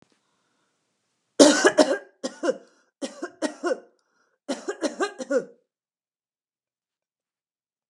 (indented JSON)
{
  "three_cough_length": "7.9 s",
  "three_cough_amplitude": 29426,
  "three_cough_signal_mean_std_ratio": 0.29,
  "survey_phase": "beta (2021-08-13 to 2022-03-07)",
  "age": "65+",
  "gender": "Female",
  "wearing_mask": "No",
  "symptom_none": true,
  "smoker_status": "Never smoked",
  "respiratory_condition_asthma": false,
  "respiratory_condition_other": false,
  "recruitment_source": "REACT",
  "submission_delay": "2 days",
  "covid_test_result": "Negative",
  "covid_test_method": "RT-qPCR",
  "influenza_a_test_result": "Negative",
  "influenza_b_test_result": "Negative"
}